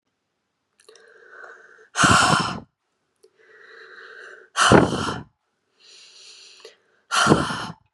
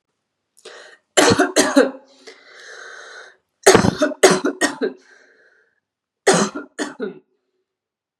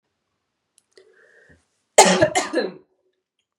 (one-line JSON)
{"exhalation_length": "7.9 s", "exhalation_amplitude": 32747, "exhalation_signal_mean_std_ratio": 0.36, "three_cough_length": "8.2 s", "three_cough_amplitude": 32768, "three_cough_signal_mean_std_ratio": 0.37, "cough_length": "3.6 s", "cough_amplitude": 32768, "cough_signal_mean_std_ratio": 0.28, "survey_phase": "beta (2021-08-13 to 2022-03-07)", "age": "18-44", "gender": "Female", "wearing_mask": "No", "symptom_none": true, "smoker_status": "Never smoked", "respiratory_condition_asthma": false, "respiratory_condition_other": false, "recruitment_source": "Test and Trace", "submission_delay": "2 days", "covid_test_result": "Positive", "covid_test_method": "RT-qPCR", "covid_ct_value": 29.7, "covid_ct_gene": "N gene"}